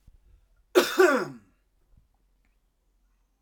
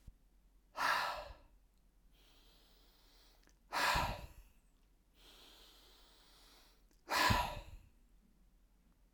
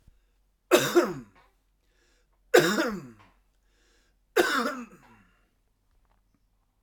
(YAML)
cough_length: 3.4 s
cough_amplitude: 17668
cough_signal_mean_std_ratio: 0.28
exhalation_length: 9.1 s
exhalation_amplitude: 3861
exhalation_signal_mean_std_ratio: 0.36
three_cough_length: 6.8 s
three_cough_amplitude: 19168
three_cough_signal_mean_std_ratio: 0.31
survey_phase: alpha (2021-03-01 to 2021-08-12)
age: 45-64
gender: Male
wearing_mask: 'No'
symptom_none: true
smoker_status: Ex-smoker
respiratory_condition_asthma: false
respiratory_condition_other: false
recruitment_source: REACT
submission_delay: 2 days
covid_test_result: Negative
covid_test_method: RT-qPCR